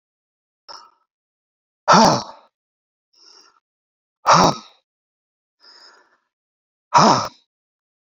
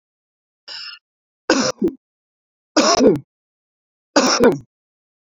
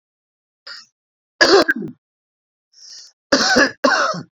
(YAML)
exhalation_length: 8.1 s
exhalation_amplitude: 32737
exhalation_signal_mean_std_ratio: 0.27
three_cough_length: 5.3 s
three_cough_amplitude: 32768
three_cough_signal_mean_std_ratio: 0.38
cough_length: 4.4 s
cough_amplitude: 31590
cough_signal_mean_std_ratio: 0.41
survey_phase: beta (2021-08-13 to 2022-03-07)
age: 45-64
gender: Male
wearing_mask: 'No'
symptom_none: true
smoker_status: Ex-smoker
respiratory_condition_asthma: false
respiratory_condition_other: false
recruitment_source: REACT
submission_delay: 2 days
covid_test_result: Negative
covid_test_method: RT-qPCR